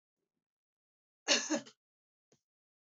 {"cough_length": "3.0 s", "cough_amplitude": 6254, "cough_signal_mean_std_ratio": 0.23, "survey_phase": "beta (2021-08-13 to 2022-03-07)", "age": "45-64", "gender": "Female", "wearing_mask": "No", "symptom_none": true, "smoker_status": "Never smoked", "respiratory_condition_asthma": false, "respiratory_condition_other": false, "recruitment_source": "REACT", "submission_delay": "2 days", "covid_test_method": "RT-qPCR", "influenza_a_test_result": "Unknown/Void", "influenza_b_test_result": "Unknown/Void"}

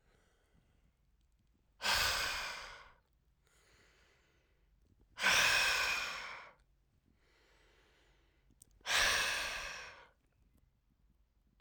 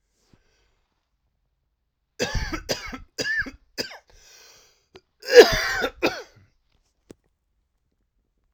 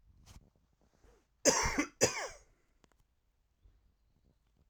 {"exhalation_length": "11.6 s", "exhalation_amplitude": 4264, "exhalation_signal_mean_std_ratio": 0.4, "three_cough_length": "8.5 s", "three_cough_amplitude": 32768, "three_cough_signal_mean_std_ratio": 0.24, "cough_length": "4.7 s", "cough_amplitude": 8778, "cough_signal_mean_std_ratio": 0.28, "survey_phase": "alpha (2021-03-01 to 2021-08-12)", "age": "45-64", "gender": "Male", "wearing_mask": "No", "symptom_cough_any": true, "symptom_fatigue": true, "symptom_fever_high_temperature": true, "symptom_headache": true, "symptom_onset": "3 days", "smoker_status": "Ex-smoker", "respiratory_condition_asthma": false, "respiratory_condition_other": false, "recruitment_source": "Test and Trace", "submission_delay": "2 days", "covid_test_result": "Positive", "covid_test_method": "RT-qPCR", "covid_ct_value": 26.0, "covid_ct_gene": "ORF1ab gene", "covid_ct_mean": 26.6, "covid_viral_load": "1900 copies/ml", "covid_viral_load_category": "Minimal viral load (< 10K copies/ml)"}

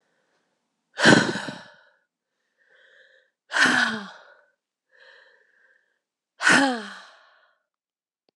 {"exhalation_length": "8.4 s", "exhalation_amplitude": 30887, "exhalation_signal_mean_std_ratio": 0.3, "survey_phase": "beta (2021-08-13 to 2022-03-07)", "age": "18-44", "gender": "Female", "wearing_mask": "No", "symptom_cough_any": true, "symptom_new_continuous_cough": true, "symptom_runny_or_blocked_nose": true, "symptom_sore_throat": true, "symptom_abdominal_pain": true, "symptom_fatigue": true, "symptom_headache": true, "symptom_change_to_sense_of_smell_or_taste": true, "symptom_onset": "4 days", "smoker_status": "Never smoked", "respiratory_condition_asthma": false, "respiratory_condition_other": false, "recruitment_source": "Test and Trace", "submission_delay": "2 days", "covid_test_result": "Positive", "covid_test_method": "RT-qPCR", "covid_ct_value": 21.6, "covid_ct_gene": "N gene", "covid_ct_mean": 21.9, "covid_viral_load": "64000 copies/ml", "covid_viral_load_category": "Low viral load (10K-1M copies/ml)"}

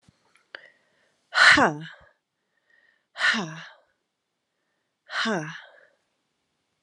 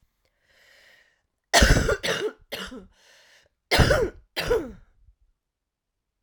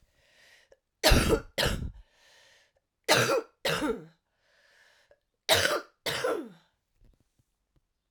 {"exhalation_length": "6.8 s", "exhalation_amplitude": 25012, "exhalation_signal_mean_std_ratio": 0.28, "cough_length": "6.2 s", "cough_amplitude": 22655, "cough_signal_mean_std_ratio": 0.37, "three_cough_length": "8.1 s", "three_cough_amplitude": 16845, "three_cough_signal_mean_std_ratio": 0.39, "survey_phase": "alpha (2021-03-01 to 2021-08-12)", "age": "45-64", "gender": "Female", "wearing_mask": "No", "symptom_cough_any": true, "symptom_fatigue": true, "symptom_headache": true, "symptom_change_to_sense_of_smell_or_taste": true, "symptom_loss_of_taste": true, "symptom_onset": "4 days", "smoker_status": "Ex-smoker", "respiratory_condition_asthma": false, "respiratory_condition_other": false, "recruitment_source": "Test and Trace", "submission_delay": "1 day", "covid_test_result": "Positive", "covid_test_method": "RT-qPCR", "covid_ct_value": 21.1, "covid_ct_gene": "ORF1ab gene"}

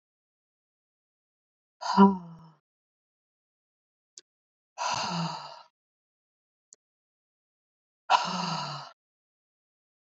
{"exhalation_length": "10.1 s", "exhalation_amplitude": 18330, "exhalation_signal_mean_std_ratio": 0.25, "survey_phase": "beta (2021-08-13 to 2022-03-07)", "age": "45-64", "gender": "Female", "wearing_mask": "No", "symptom_none": true, "smoker_status": "Never smoked", "respiratory_condition_asthma": false, "respiratory_condition_other": false, "recruitment_source": "REACT", "submission_delay": "1 day", "covid_test_result": "Negative", "covid_test_method": "RT-qPCR", "influenza_a_test_result": "Negative", "influenza_b_test_result": "Negative"}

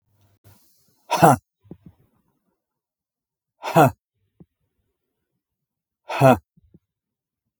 {"exhalation_length": "7.6 s", "exhalation_amplitude": 32766, "exhalation_signal_mean_std_ratio": 0.22, "survey_phase": "beta (2021-08-13 to 2022-03-07)", "age": "45-64", "gender": "Male", "wearing_mask": "No", "symptom_none": true, "smoker_status": "Ex-smoker", "respiratory_condition_asthma": false, "respiratory_condition_other": false, "recruitment_source": "REACT", "submission_delay": "2 days", "covid_test_result": "Negative", "covid_test_method": "RT-qPCR", "influenza_a_test_result": "Negative", "influenza_b_test_result": "Negative"}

